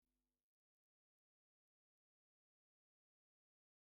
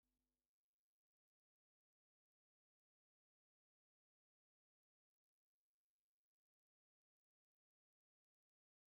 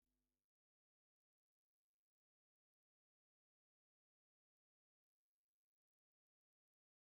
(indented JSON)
{
  "cough_length": "3.8 s",
  "cough_amplitude": 2,
  "cough_signal_mean_std_ratio": 0.18,
  "three_cough_length": "8.9 s",
  "three_cough_amplitude": 2,
  "three_cough_signal_mean_std_ratio": 0.13,
  "exhalation_length": "7.2 s",
  "exhalation_amplitude": 2,
  "exhalation_signal_mean_std_ratio": 0.14,
  "survey_phase": "beta (2021-08-13 to 2022-03-07)",
  "age": "45-64",
  "gender": "Male",
  "wearing_mask": "No",
  "symptom_other": true,
  "smoker_status": "Ex-smoker",
  "respiratory_condition_asthma": false,
  "respiratory_condition_other": false,
  "recruitment_source": "REACT",
  "submission_delay": "3 days",
  "covid_test_result": "Positive",
  "covid_test_method": "RT-qPCR",
  "covid_ct_value": 23.0,
  "covid_ct_gene": "E gene",
  "influenza_a_test_result": "Negative",
  "influenza_b_test_result": "Negative"
}